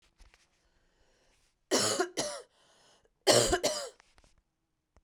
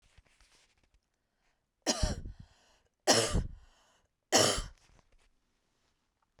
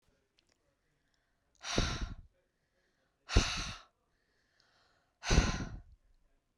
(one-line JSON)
{"cough_length": "5.0 s", "cough_amplitude": 10461, "cough_signal_mean_std_ratio": 0.35, "three_cough_length": "6.4 s", "three_cough_amplitude": 10874, "three_cough_signal_mean_std_ratio": 0.31, "exhalation_length": "6.6 s", "exhalation_amplitude": 9107, "exhalation_signal_mean_std_ratio": 0.31, "survey_phase": "beta (2021-08-13 to 2022-03-07)", "age": "18-44", "gender": "Female", "wearing_mask": "No", "symptom_cough_any": true, "symptom_fatigue": true, "symptom_onset": "12 days", "smoker_status": "Never smoked", "respiratory_condition_asthma": false, "respiratory_condition_other": false, "recruitment_source": "REACT", "submission_delay": "1 day", "covid_test_result": "Negative", "covid_test_method": "RT-qPCR"}